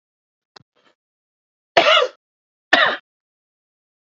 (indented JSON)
{
  "cough_length": "4.0 s",
  "cough_amplitude": 28512,
  "cough_signal_mean_std_ratio": 0.28,
  "survey_phase": "beta (2021-08-13 to 2022-03-07)",
  "age": "18-44",
  "gender": "Male",
  "wearing_mask": "No",
  "symptom_shortness_of_breath": true,
  "symptom_fatigue": true,
  "symptom_headache": true,
  "symptom_other": true,
  "symptom_onset": "12 days",
  "smoker_status": "Ex-smoker",
  "respiratory_condition_asthma": true,
  "respiratory_condition_other": false,
  "recruitment_source": "REACT",
  "submission_delay": "0 days",
  "covid_test_result": "Negative",
  "covid_test_method": "RT-qPCR",
  "influenza_a_test_result": "Negative",
  "influenza_b_test_result": "Negative"
}